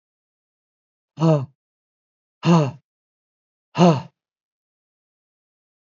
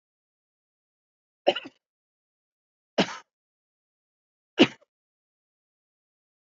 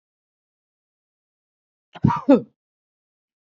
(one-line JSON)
{"exhalation_length": "5.9 s", "exhalation_amplitude": 25518, "exhalation_signal_mean_std_ratio": 0.27, "three_cough_length": "6.5 s", "three_cough_amplitude": 20529, "three_cough_signal_mean_std_ratio": 0.14, "cough_length": "3.5 s", "cough_amplitude": 25121, "cough_signal_mean_std_ratio": 0.2, "survey_phase": "beta (2021-08-13 to 2022-03-07)", "age": "65+", "gender": "Male", "wearing_mask": "No", "symptom_none": true, "symptom_onset": "13 days", "smoker_status": "Never smoked", "respiratory_condition_asthma": false, "respiratory_condition_other": false, "recruitment_source": "REACT", "submission_delay": "2 days", "covid_test_result": "Negative", "covid_test_method": "RT-qPCR", "influenza_a_test_result": "Negative", "influenza_b_test_result": "Negative"}